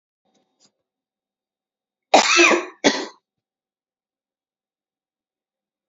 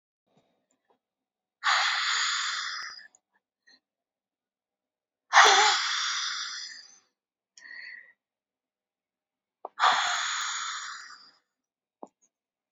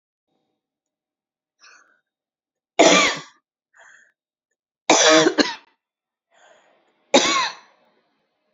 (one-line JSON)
{"cough_length": "5.9 s", "cough_amplitude": 31701, "cough_signal_mean_std_ratio": 0.25, "exhalation_length": "12.7 s", "exhalation_amplitude": 19674, "exhalation_signal_mean_std_ratio": 0.38, "three_cough_length": "8.5 s", "three_cough_amplitude": 31270, "three_cough_signal_mean_std_ratio": 0.3, "survey_phase": "beta (2021-08-13 to 2022-03-07)", "age": "45-64", "gender": "Female", "wearing_mask": "No", "symptom_none": true, "smoker_status": "Ex-smoker", "respiratory_condition_asthma": true, "respiratory_condition_other": false, "recruitment_source": "REACT", "submission_delay": "3 days", "covid_test_result": "Negative", "covid_test_method": "RT-qPCR", "influenza_a_test_result": "Negative", "influenza_b_test_result": "Negative"}